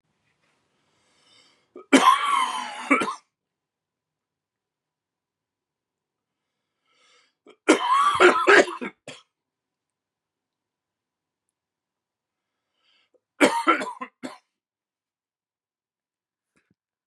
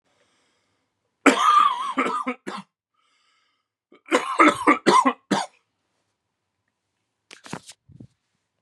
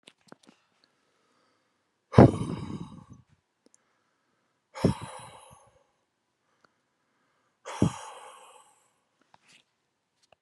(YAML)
three_cough_length: 17.1 s
three_cough_amplitude: 28813
three_cough_signal_mean_std_ratio: 0.27
cough_length: 8.6 s
cough_amplitude: 32487
cough_signal_mean_std_ratio: 0.35
exhalation_length: 10.4 s
exhalation_amplitude: 32768
exhalation_signal_mean_std_ratio: 0.17
survey_phase: beta (2021-08-13 to 2022-03-07)
age: 18-44
gender: Male
wearing_mask: 'No'
symptom_cough_any: true
symptom_runny_or_blocked_nose: true
symptom_sore_throat: true
symptom_diarrhoea: true
symptom_fatigue: true
symptom_headache: true
symptom_change_to_sense_of_smell_or_taste: true
smoker_status: Never smoked
respiratory_condition_asthma: false
respiratory_condition_other: false
recruitment_source: Test and Trace
submission_delay: 1 day
covid_test_result: Positive
covid_test_method: RT-qPCR
covid_ct_value: 19.6
covid_ct_gene: N gene